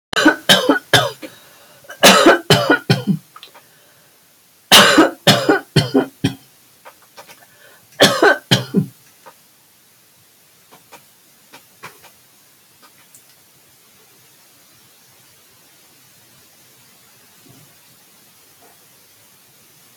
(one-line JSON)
{"cough_length": "20.0 s", "cough_amplitude": 32768, "cough_signal_mean_std_ratio": 0.32, "survey_phase": "alpha (2021-03-01 to 2021-08-12)", "age": "65+", "gender": "Female", "wearing_mask": "No", "symptom_none": true, "smoker_status": "Ex-smoker", "respiratory_condition_asthma": false, "respiratory_condition_other": false, "recruitment_source": "REACT", "submission_delay": "4 days", "covid_test_result": "Negative", "covid_test_method": "RT-qPCR"}